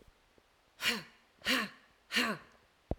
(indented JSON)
{
  "exhalation_length": "3.0 s",
  "exhalation_amplitude": 4938,
  "exhalation_signal_mean_std_ratio": 0.4,
  "survey_phase": "alpha (2021-03-01 to 2021-08-12)",
  "age": "45-64",
  "gender": "Female",
  "wearing_mask": "No",
  "symptom_none": true,
  "smoker_status": "Current smoker (e-cigarettes or vapes only)",
  "respiratory_condition_asthma": false,
  "respiratory_condition_other": false,
  "recruitment_source": "REACT",
  "submission_delay": "11 days",
  "covid_test_result": "Negative",
  "covid_test_method": "RT-qPCR"
}